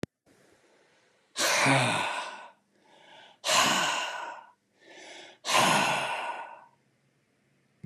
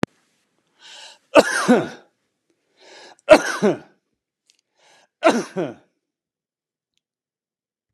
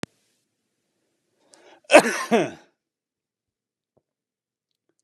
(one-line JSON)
{"exhalation_length": "7.9 s", "exhalation_amplitude": 9992, "exhalation_signal_mean_std_ratio": 0.5, "three_cough_length": "7.9 s", "three_cough_amplitude": 32768, "three_cough_signal_mean_std_ratio": 0.26, "cough_length": "5.0 s", "cough_amplitude": 32766, "cough_signal_mean_std_ratio": 0.19, "survey_phase": "beta (2021-08-13 to 2022-03-07)", "age": "65+", "gender": "Male", "wearing_mask": "No", "symptom_cough_any": true, "symptom_runny_or_blocked_nose": true, "smoker_status": "Never smoked", "respiratory_condition_asthma": false, "respiratory_condition_other": false, "recruitment_source": "Test and Trace", "submission_delay": "2 days", "covid_test_result": "Positive", "covid_test_method": "ePCR"}